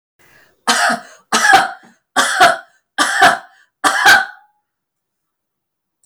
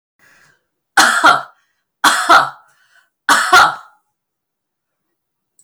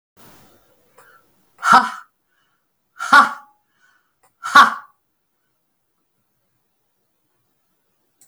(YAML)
cough_length: 6.1 s
cough_amplitude: 32768
cough_signal_mean_std_ratio: 0.45
three_cough_length: 5.6 s
three_cough_amplitude: 32768
three_cough_signal_mean_std_ratio: 0.38
exhalation_length: 8.3 s
exhalation_amplitude: 32768
exhalation_signal_mean_std_ratio: 0.22
survey_phase: beta (2021-08-13 to 2022-03-07)
age: 65+
gender: Female
wearing_mask: 'No'
symptom_none: true
smoker_status: Ex-smoker
respiratory_condition_asthma: false
respiratory_condition_other: false
recruitment_source: REACT
submission_delay: 2 days
covid_test_result: Negative
covid_test_method: RT-qPCR
influenza_a_test_result: Negative
influenza_b_test_result: Negative